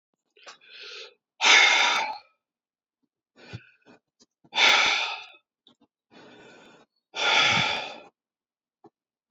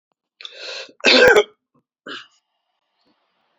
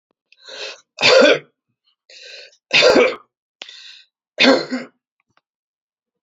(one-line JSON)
{"exhalation_length": "9.3 s", "exhalation_amplitude": 22360, "exhalation_signal_mean_std_ratio": 0.38, "cough_length": "3.6 s", "cough_amplitude": 31287, "cough_signal_mean_std_ratio": 0.3, "three_cough_length": "6.2 s", "three_cough_amplitude": 32768, "three_cough_signal_mean_std_ratio": 0.36, "survey_phase": "beta (2021-08-13 to 2022-03-07)", "age": "65+", "gender": "Male", "wearing_mask": "No", "symptom_cough_any": true, "symptom_runny_or_blocked_nose": true, "symptom_fever_high_temperature": true, "smoker_status": "Never smoked", "respiratory_condition_asthma": true, "respiratory_condition_other": false, "recruitment_source": "Test and Trace", "submission_delay": "0 days", "covid_test_result": "Positive", "covid_test_method": "LFT"}